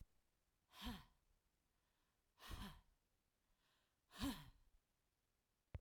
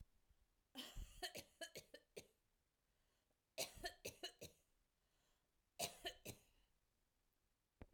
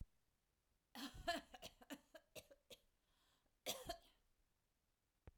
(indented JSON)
{
  "exhalation_length": "5.8 s",
  "exhalation_amplitude": 647,
  "exhalation_signal_mean_std_ratio": 0.33,
  "three_cough_length": "7.9 s",
  "three_cough_amplitude": 854,
  "three_cough_signal_mean_std_ratio": 0.37,
  "cough_length": "5.4 s",
  "cough_amplitude": 1075,
  "cough_signal_mean_std_ratio": 0.35,
  "survey_phase": "alpha (2021-03-01 to 2021-08-12)",
  "age": "45-64",
  "gender": "Female",
  "wearing_mask": "No",
  "symptom_none": true,
  "smoker_status": "Current smoker (e-cigarettes or vapes only)",
  "respiratory_condition_asthma": false,
  "respiratory_condition_other": true,
  "recruitment_source": "REACT",
  "submission_delay": "2 days",
  "covid_test_result": "Negative",
  "covid_test_method": "RT-qPCR"
}